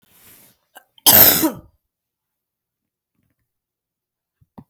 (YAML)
cough_length: 4.7 s
cough_amplitude: 32768
cough_signal_mean_std_ratio: 0.23
survey_phase: beta (2021-08-13 to 2022-03-07)
age: 65+
gender: Female
wearing_mask: 'No'
symptom_none: true
smoker_status: Never smoked
respiratory_condition_asthma: false
respiratory_condition_other: false
recruitment_source: REACT
submission_delay: 1 day
covid_test_result: Negative
covid_test_method: RT-qPCR